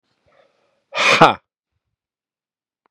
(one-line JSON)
{"exhalation_length": "2.9 s", "exhalation_amplitude": 32768, "exhalation_signal_mean_std_ratio": 0.25, "survey_phase": "beta (2021-08-13 to 2022-03-07)", "age": "45-64", "gender": "Male", "wearing_mask": "No", "symptom_none": true, "smoker_status": "Never smoked", "respiratory_condition_asthma": false, "respiratory_condition_other": false, "recruitment_source": "REACT", "submission_delay": "2 days", "covid_test_result": "Negative", "covid_test_method": "RT-qPCR", "influenza_a_test_result": "Negative", "influenza_b_test_result": "Negative"}